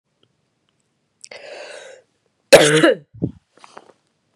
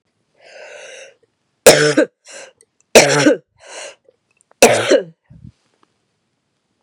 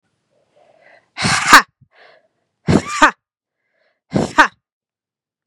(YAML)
cough_length: 4.4 s
cough_amplitude: 32768
cough_signal_mean_std_ratio: 0.26
three_cough_length: 6.8 s
three_cough_amplitude: 32768
three_cough_signal_mean_std_ratio: 0.33
exhalation_length: 5.5 s
exhalation_amplitude: 32768
exhalation_signal_mean_std_ratio: 0.29
survey_phase: beta (2021-08-13 to 2022-03-07)
age: 18-44
gender: Female
wearing_mask: 'No'
symptom_new_continuous_cough: true
symptom_runny_or_blocked_nose: true
symptom_shortness_of_breath: true
symptom_sore_throat: true
symptom_headache: true
symptom_change_to_sense_of_smell_or_taste: true
symptom_loss_of_taste: true
symptom_onset: 5 days
smoker_status: Never smoked
respiratory_condition_asthma: false
respiratory_condition_other: false
recruitment_source: Test and Trace
submission_delay: 1 day
covid_test_result: Positive
covid_test_method: RT-qPCR